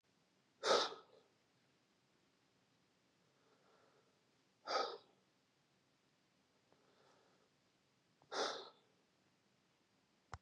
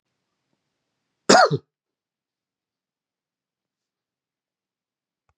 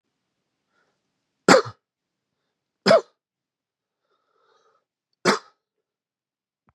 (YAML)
exhalation_length: 10.4 s
exhalation_amplitude: 2786
exhalation_signal_mean_std_ratio: 0.24
cough_length: 5.4 s
cough_amplitude: 30832
cough_signal_mean_std_ratio: 0.16
three_cough_length: 6.7 s
three_cough_amplitude: 32767
three_cough_signal_mean_std_ratio: 0.19
survey_phase: beta (2021-08-13 to 2022-03-07)
age: 18-44
gender: Male
wearing_mask: 'Yes'
symptom_none: true
symptom_onset: 1 day
smoker_status: Never smoked
respiratory_condition_asthma: false
respiratory_condition_other: false
recruitment_source: Test and Trace
submission_delay: 1 day
covid_test_result: Negative
covid_test_method: RT-qPCR